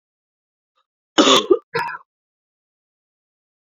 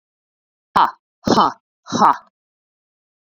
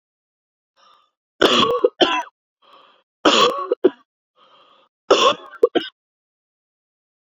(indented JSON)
{
  "cough_length": "3.7 s",
  "cough_amplitude": 28440,
  "cough_signal_mean_std_ratio": 0.27,
  "exhalation_length": "3.3 s",
  "exhalation_amplitude": 32100,
  "exhalation_signal_mean_std_ratio": 0.32,
  "three_cough_length": "7.3 s",
  "three_cough_amplitude": 28129,
  "three_cough_signal_mean_std_ratio": 0.35,
  "survey_phase": "beta (2021-08-13 to 2022-03-07)",
  "age": "18-44",
  "gender": "Female",
  "wearing_mask": "No",
  "symptom_cough_any": true,
  "symptom_runny_or_blocked_nose": true,
  "symptom_fatigue": true,
  "symptom_headache": true,
  "smoker_status": "Never smoked",
  "respiratory_condition_asthma": false,
  "respiratory_condition_other": false,
  "recruitment_source": "Test and Trace",
  "submission_delay": "2 days",
  "covid_test_result": "Positive",
  "covid_test_method": "RT-qPCR"
}